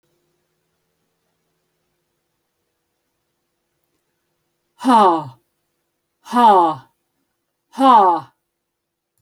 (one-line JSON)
{"exhalation_length": "9.2 s", "exhalation_amplitude": 27837, "exhalation_signal_mean_std_ratio": 0.3, "survey_phase": "beta (2021-08-13 to 2022-03-07)", "age": "65+", "gender": "Female", "wearing_mask": "No", "symptom_cough_any": true, "symptom_sore_throat": true, "smoker_status": "Never smoked", "respiratory_condition_asthma": false, "respiratory_condition_other": false, "recruitment_source": "REACT", "submission_delay": "1 day", "covid_test_result": "Negative", "covid_test_method": "RT-qPCR"}